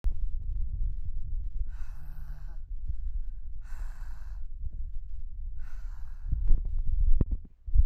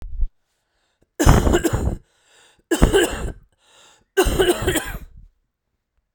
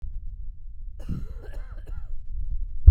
exhalation_length: 7.9 s
exhalation_amplitude: 12250
exhalation_signal_mean_std_ratio: 0.82
three_cough_length: 6.1 s
three_cough_amplitude: 32767
three_cough_signal_mean_std_ratio: 0.45
cough_length: 2.9 s
cough_amplitude: 32768
cough_signal_mean_std_ratio: 0.5
survey_phase: beta (2021-08-13 to 2022-03-07)
age: 45-64
gender: Male
wearing_mask: 'No'
symptom_cough_any: true
symptom_runny_or_blocked_nose: true
symptom_shortness_of_breath: true
symptom_fatigue: true
symptom_change_to_sense_of_smell_or_taste: true
symptom_loss_of_taste: true
symptom_onset: 5 days
smoker_status: Never smoked
respiratory_condition_asthma: false
respiratory_condition_other: false
recruitment_source: Test and Trace
submission_delay: 2 days
covid_test_result: Positive
covid_test_method: RT-qPCR
covid_ct_value: 20.7
covid_ct_gene: ORF1ab gene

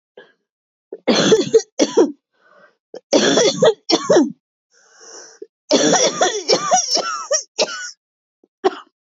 cough_length: 9.0 s
cough_amplitude: 28792
cough_signal_mean_std_ratio: 0.51
survey_phase: beta (2021-08-13 to 2022-03-07)
age: 45-64
gender: Female
wearing_mask: 'No'
symptom_cough_any: true
symptom_runny_or_blocked_nose: true
symptom_headache: true
symptom_onset: 2 days
smoker_status: Never smoked
respiratory_condition_asthma: false
respiratory_condition_other: false
recruitment_source: Test and Trace
submission_delay: 2 days
covid_test_result: Positive
covid_test_method: RT-qPCR
covid_ct_value: 17.8
covid_ct_gene: ORF1ab gene
covid_ct_mean: 18.1
covid_viral_load: 1100000 copies/ml
covid_viral_load_category: High viral load (>1M copies/ml)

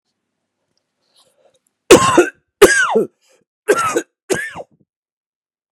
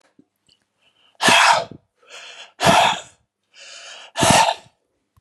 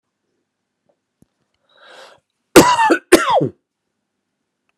three_cough_length: 5.7 s
three_cough_amplitude: 32768
three_cough_signal_mean_std_ratio: 0.34
exhalation_length: 5.2 s
exhalation_amplitude: 31495
exhalation_signal_mean_std_ratio: 0.4
cough_length: 4.8 s
cough_amplitude: 32768
cough_signal_mean_std_ratio: 0.3
survey_phase: beta (2021-08-13 to 2022-03-07)
age: 45-64
gender: Male
wearing_mask: 'No'
symptom_fatigue: true
symptom_change_to_sense_of_smell_or_taste: true
symptom_loss_of_taste: true
symptom_onset: 4 days
smoker_status: Never smoked
respiratory_condition_asthma: false
respiratory_condition_other: false
recruitment_source: Test and Trace
submission_delay: 2 days
covid_test_result: Positive
covid_test_method: RT-qPCR
covid_ct_value: 19.5
covid_ct_gene: ORF1ab gene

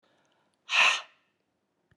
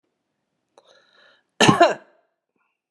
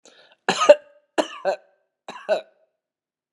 exhalation_length: 2.0 s
exhalation_amplitude: 10961
exhalation_signal_mean_std_ratio: 0.3
cough_length: 2.9 s
cough_amplitude: 32712
cough_signal_mean_std_ratio: 0.25
three_cough_length: 3.3 s
three_cough_amplitude: 32693
three_cough_signal_mean_std_ratio: 0.27
survey_phase: beta (2021-08-13 to 2022-03-07)
age: 65+
gender: Female
wearing_mask: 'No'
symptom_cough_any: true
symptom_runny_or_blocked_nose: true
smoker_status: Ex-smoker
respiratory_condition_asthma: false
respiratory_condition_other: false
recruitment_source: Test and Trace
submission_delay: 2 days
covid_test_result: Positive
covid_test_method: LFT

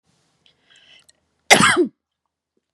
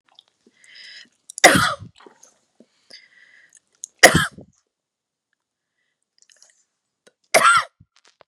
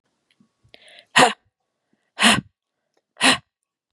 cough_length: 2.7 s
cough_amplitude: 32768
cough_signal_mean_std_ratio: 0.28
three_cough_length: 8.3 s
three_cough_amplitude: 32768
three_cough_signal_mean_std_ratio: 0.24
exhalation_length: 3.9 s
exhalation_amplitude: 32767
exhalation_signal_mean_std_ratio: 0.28
survey_phase: beta (2021-08-13 to 2022-03-07)
age: 18-44
gender: Female
wearing_mask: 'No'
symptom_none: true
smoker_status: Never smoked
respiratory_condition_asthma: false
respiratory_condition_other: false
recruitment_source: REACT
submission_delay: 4 days
covid_test_result: Negative
covid_test_method: RT-qPCR
influenza_a_test_result: Negative
influenza_b_test_result: Negative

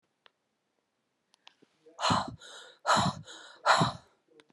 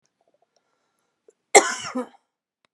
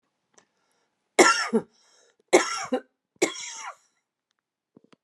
exhalation_length: 4.5 s
exhalation_amplitude: 11347
exhalation_signal_mean_std_ratio: 0.36
cough_length: 2.7 s
cough_amplitude: 32768
cough_signal_mean_std_ratio: 0.2
three_cough_length: 5.0 s
three_cough_amplitude: 27810
three_cough_signal_mean_std_ratio: 0.29
survey_phase: beta (2021-08-13 to 2022-03-07)
age: 45-64
gender: Female
wearing_mask: 'No'
symptom_runny_or_blocked_nose: true
symptom_fatigue: true
symptom_headache: true
symptom_onset: 5 days
smoker_status: Current smoker (e-cigarettes or vapes only)
respiratory_condition_asthma: false
respiratory_condition_other: false
recruitment_source: Test and Trace
submission_delay: 3 days
covid_test_result: Positive
covid_test_method: RT-qPCR
covid_ct_value: 24.2
covid_ct_gene: N gene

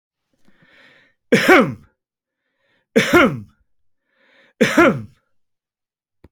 three_cough_length: 6.3 s
three_cough_amplitude: 29871
three_cough_signal_mean_std_ratio: 0.32
survey_phase: beta (2021-08-13 to 2022-03-07)
age: 65+
gender: Male
wearing_mask: 'No'
symptom_none: true
smoker_status: Never smoked
respiratory_condition_asthma: false
respiratory_condition_other: false
recruitment_source: REACT
submission_delay: 2 days
covid_test_result: Negative
covid_test_method: RT-qPCR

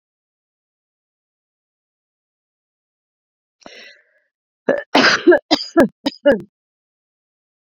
cough_length: 7.8 s
cough_amplitude: 31322
cough_signal_mean_std_ratio: 0.26
survey_phase: beta (2021-08-13 to 2022-03-07)
age: 45-64
gender: Female
wearing_mask: 'No'
symptom_none: true
smoker_status: Never smoked
respiratory_condition_asthma: false
respiratory_condition_other: false
recruitment_source: REACT
submission_delay: 1 day
covid_test_result: Negative
covid_test_method: RT-qPCR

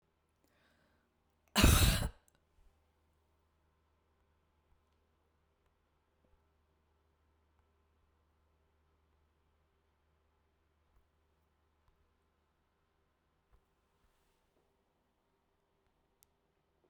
cough_length: 16.9 s
cough_amplitude: 8989
cough_signal_mean_std_ratio: 0.15
survey_phase: beta (2021-08-13 to 2022-03-07)
age: 65+
gender: Female
wearing_mask: 'No'
symptom_none: true
smoker_status: Never smoked
respiratory_condition_asthma: false
respiratory_condition_other: false
recruitment_source: REACT
submission_delay: 3 days
covid_test_result: Negative
covid_test_method: RT-qPCR
influenza_a_test_result: Negative
influenza_b_test_result: Negative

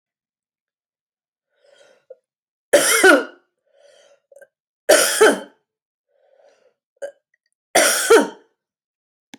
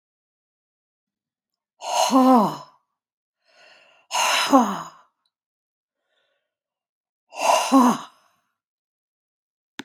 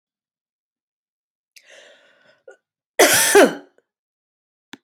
three_cough_length: 9.4 s
three_cough_amplitude: 32056
three_cough_signal_mean_std_ratio: 0.3
exhalation_length: 9.8 s
exhalation_amplitude: 24574
exhalation_signal_mean_std_ratio: 0.34
cough_length: 4.8 s
cough_amplitude: 29313
cough_signal_mean_std_ratio: 0.26
survey_phase: alpha (2021-03-01 to 2021-08-12)
age: 65+
gender: Female
wearing_mask: 'No'
symptom_none: true
symptom_onset: 9 days
smoker_status: Ex-smoker
respiratory_condition_asthma: false
respiratory_condition_other: false
recruitment_source: REACT
submission_delay: 2 days
covid_test_result: Negative
covid_test_method: RT-qPCR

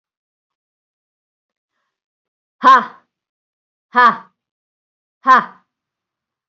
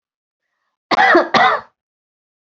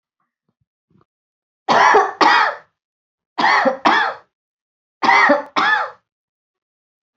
exhalation_length: 6.5 s
exhalation_amplitude: 29398
exhalation_signal_mean_std_ratio: 0.24
cough_length: 2.6 s
cough_amplitude: 32570
cough_signal_mean_std_ratio: 0.4
three_cough_length: 7.2 s
three_cough_amplitude: 27703
three_cough_signal_mean_std_ratio: 0.45
survey_phase: beta (2021-08-13 to 2022-03-07)
age: 45-64
gender: Female
wearing_mask: 'No'
symptom_change_to_sense_of_smell_or_taste: true
smoker_status: Ex-smoker
respiratory_condition_asthma: false
respiratory_condition_other: false
recruitment_source: REACT
submission_delay: 2 days
covid_test_result: Negative
covid_test_method: RT-qPCR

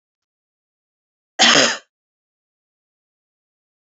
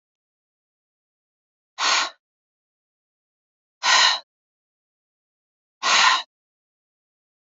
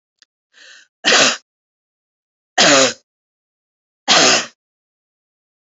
cough_length: 3.8 s
cough_amplitude: 32767
cough_signal_mean_std_ratio: 0.23
exhalation_length: 7.4 s
exhalation_amplitude: 23700
exhalation_signal_mean_std_ratio: 0.29
three_cough_length: 5.7 s
three_cough_amplitude: 31712
three_cough_signal_mean_std_ratio: 0.34
survey_phase: beta (2021-08-13 to 2022-03-07)
age: 45-64
gender: Female
wearing_mask: 'No'
symptom_none: true
smoker_status: Never smoked
respiratory_condition_asthma: false
respiratory_condition_other: false
recruitment_source: REACT
submission_delay: 1 day
covid_test_result: Negative
covid_test_method: RT-qPCR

